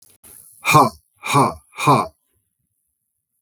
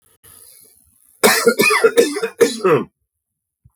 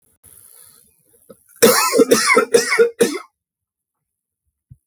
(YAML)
exhalation_length: 3.4 s
exhalation_amplitude: 32766
exhalation_signal_mean_std_ratio: 0.37
cough_length: 3.8 s
cough_amplitude: 32768
cough_signal_mean_std_ratio: 0.47
three_cough_length: 4.9 s
three_cough_amplitude: 32768
three_cough_signal_mean_std_ratio: 0.41
survey_phase: beta (2021-08-13 to 2022-03-07)
age: 18-44
gender: Male
wearing_mask: 'No'
symptom_none: true
smoker_status: Ex-smoker
respiratory_condition_asthma: false
respiratory_condition_other: false
recruitment_source: REACT
submission_delay: 1 day
covid_test_result: Negative
covid_test_method: RT-qPCR
influenza_a_test_result: Negative
influenza_b_test_result: Negative